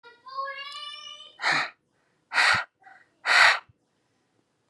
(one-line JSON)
{"exhalation_length": "4.7 s", "exhalation_amplitude": 20582, "exhalation_signal_mean_std_ratio": 0.39, "survey_phase": "beta (2021-08-13 to 2022-03-07)", "age": "18-44", "gender": "Female", "wearing_mask": "No", "symptom_cough_any": true, "symptom_runny_or_blocked_nose": true, "symptom_fatigue": true, "symptom_headache": true, "symptom_change_to_sense_of_smell_or_taste": true, "symptom_loss_of_taste": true, "symptom_onset": "4 days", "smoker_status": "Never smoked", "respiratory_condition_asthma": false, "respiratory_condition_other": false, "recruitment_source": "Test and Trace", "submission_delay": "2 days", "covid_test_result": "Positive", "covid_test_method": "RT-qPCR", "covid_ct_value": 22.9, "covid_ct_gene": "N gene"}